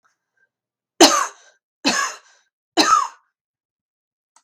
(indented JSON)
{
  "three_cough_length": "4.4 s",
  "three_cough_amplitude": 32768,
  "three_cough_signal_mean_std_ratio": 0.31,
  "survey_phase": "beta (2021-08-13 to 2022-03-07)",
  "age": "45-64",
  "gender": "Female",
  "wearing_mask": "No",
  "symptom_cough_any": true,
  "symptom_shortness_of_breath": true,
  "symptom_onset": "12 days",
  "smoker_status": "Never smoked",
  "respiratory_condition_asthma": false,
  "respiratory_condition_other": false,
  "recruitment_source": "REACT",
  "submission_delay": "3 days",
  "covid_test_result": "Negative",
  "covid_test_method": "RT-qPCR"
}